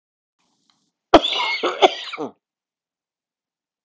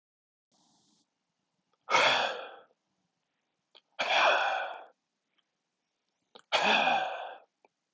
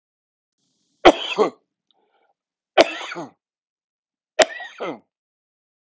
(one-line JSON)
{"cough_length": "3.8 s", "cough_amplitude": 32768, "cough_signal_mean_std_ratio": 0.28, "exhalation_length": "7.9 s", "exhalation_amplitude": 9285, "exhalation_signal_mean_std_ratio": 0.4, "three_cough_length": "5.9 s", "three_cough_amplitude": 32768, "three_cough_signal_mean_std_ratio": 0.23, "survey_phase": "alpha (2021-03-01 to 2021-08-12)", "age": "45-64", "gender": "Male", "wearing_mask": "No", "symptom_cough_any": true, "symptom_fatigue": true, "symptom_onset": "3 days", "smoker_status": "Ex-smoker", "respiratory_condition_asthma": false, "respiratory_condition_other": false, "recruitment_source": "Test and Trace", "submission_delay": "1 day", "covid_test_result": "Positive", "covid_test_method": "RT-qPCR", "covid_ct_value": 20.4, "covid_ct_gene": "ORF1ab gene", "covid_ct_mean": 21.8, "covid_viral_load": "73000 copies/ml", "covid_viral_load_category": "Low viral load (10K-1M copies/ml)"}